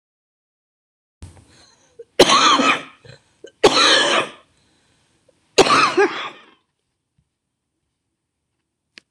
{"three_cough_length": "9.1 s", "three_cough_amplitude": 26028, "three_cough_signal_mean_std_ratio": 0.36, "survey_phase": "beta (2021-08-13 to 2022-03-07)", "age": "65+", "gender": "Female", "wearing_mask": "Yes", "symptom_cough_any": true, "symptom_new_continuous_cough": true, "symptom_shortness_of_breath": true, "symptom_onset": "12 days", "smoker_status": "Ex-smoker", "respiratory_condition_asthma": false, "respiratory_condition_other": true, "recruitment_source": "REACT", "submission_delay": "1 day", "covid_test_result": "Negative", "covid_test_method": "RT-qPCR", "influenza_a_test_result": "Negative", "influenza_b_test_result": "Negative"}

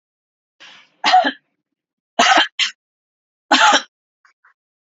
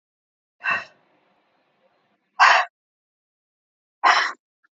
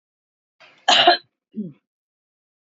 {"three_cough_length": "4.9 s", "three_cough_amplitude": 32768, "three_cough_signal_mean_std_ratio": 0.35, "exhalation_length": "4.8 s", "exhalation_amplitude": 26823, "exhalation_signal_mean_std_ratio": 0.28, "cough_length": "2.6 s", "cough_amplitude": 26872, "cough_signal_mean_std_ratio": 0.28, "survey_phase": "beta (2021-08-13 to 2022-03-07)", "age": "65+", "gender": "Female", "wearing_mask": "No", "symptom_none": true, "smoker_status": "Never smoked", "respiratory_condition_asthma": false, "respiratory_condition_other": false, "recruitment_source": "REACT", "submission_delay": "1 day", "covid_test_result": "Negative", "covid_test_method": "RT-qPCR", "influenza_a_test_result": "Negative", "influenza_b_test_result": "Negative"}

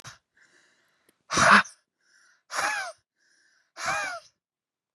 {"exhalation_length": "4.9 s", "exhalation_amplitude": 22561, "exhalation_signal_mean_std_ratio": 0.3, "survey_phase": "beta (2021-08-13 to 2022-03-07)", "age": "18-44", "gender": "Female", "wearing_mask": "No", "symptom_none": true, "smoker_status": "Never smoked", "respiratory_condition_asthma": false, "respiratory_condition_other": false, "recruitment_source": "REACT", "submission_delay": "1 day", "covid_test_result": "Negative", "covid_test_method": "RT-qPCR", "influenza_a_test_result": "Negative", "influenza_b_test_result": "Negative"}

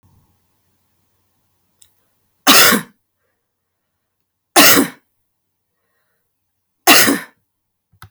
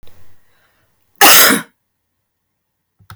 {"three_cough_length": "8.1 s", "three_cough_amplitude": 32768, "three_cough_signal_mean_std_ratio": 0.28, "cough_length": "3.2 s", "cough_amplitude": 32768, "cough_signal_mean_std_ratio": 0.32, "survey_phase": "alpha (2021-03-01 to 2021-08-12)", "age": "65+", "gender": "Female", "wearing_mask": "No", "symptom_none": true, "smoker_status": "Never smoked", "respiratory_condition_asthma": false, "respiratory_condition_other": false, "recruitment_source": "REACT", "submission_delay": "2 days", "covid_test_result": "Negative", "covid_test_method": "RT-qPCR"}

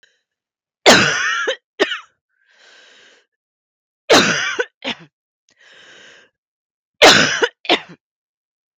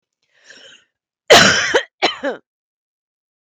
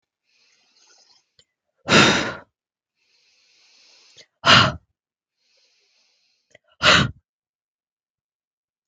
{"three_cough_length": "8.8 s", "three_cough_amplitude": 32768, "three_cough_signal_mean_std_ratio": 0.34, "cough_length": "3.4 s", "cough_amplitude": 32768, "cough_signal_mean_std_ratio": 0.34, "exhalation_length": "8.9 s", "exhalation_amplitude": 32768, "exhalation_signal_mean_std_ratio": 0.25, "survey_phase": "beta (2021-08-13 to 2022-03-07)", "age": "45-64", "gender": "Female", "wearing_mask": "No", "symptom_cough_any": true, "symptom_runny_or_blocked_nose": true, "symptom_headache": true, "symptom_onset": "3 days", "smoker_status": "Ex-smoker", "respiratory_condition_asthma": false, "respiratory_condition_other": false, "recruitment_source": "Test and Trace", "submission_delay": "2 days", "covid_test_result": "Positive", "covid_test_method": "RT-qPCR", "covid_ct_value": 18.5, "covid_ct_gene": "ORF1ab gene", "covid_ct_mean": 18.9, "covid_viral_load": "640000 copies/ml", "covid_viral_load_category": "Low viral load (10K-1M copies/ml)"}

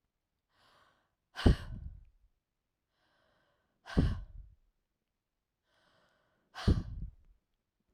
{"exhalation_length": "7.9 s", "exhalation_amplitude": 11060, "exhalation_signal_mean_std_ratio": 0.24, "survey_phase": "alpha (2021-03-01 to 2021-08-12)", "age": "45-64", "gender": "Female", "wearing_mask": "No", "symptom_cough_any": true, "smoker_status": "Never smoked", "respiratory_condition_asthma": false, "respiratory_condition_other": false, "recruitment_source": "REACT", "submission_delay": "2 days", "covid_test_result": "Negative", "covid_test_method": "RT-qPCR"}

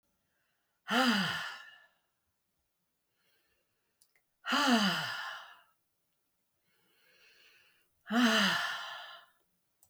{"exhalation_length": "9.9 s", "exhalation_amplitude": 5350, "exhalation_signal_mean_std_ratio": 0.39, "survey_phase": "beta (2021-08-13 to 2022-03-07)", "age": "65+", "gender": "Female", "wearing_mask": "No", "symptom_none": true, "smoker_status": "Never smoked", "respiratory_condition_asthma": false, "respiratory_condition_other": false, "recruitment_source": "REACT", "submission_delay": "1 day", "covid_test_result": "Negative", "covid_test_method": "RT-qPCR"}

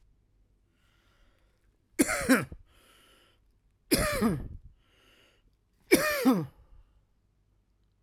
{"three_cough_length": "8.0 s", "three_cough_amplitude": 14942, "three_cough_signal_mean_std_ratio": 0.33, "survey_phase": "beta (2021-08-13 to 2022-03-07)", "age": "45-64", "gender": "Male", "wearing_mask": "Yes", "symptom_cough_any": true, "symptom_new_continuous_cough": true, "symptom_runny_or_blocked_nose": true, "symptom_sore_throat": true, "symptom_abdominal_pain": true, "symptom_fatigue": true, "symptom_fever_high_temperature": true, "symptom_headache": true, "symptom_change_to_sense_of_smell_or_taste": true, "symptom_loss_of_taste": true, "symptom_other": true, "symptom_onset": "3 days", "smoker_status": "Ex-smoker", "respiratory_condition_asthma": true, "respiratory_condition_other": false, "recruitment_source": "Test and Trace", "submission_delay": "2 days", "covid_test_result": "Positive", "covid_test_method": "RT-qPCR", "covid_ct_value": 18.9, "covid_ct_gene": "N gene"}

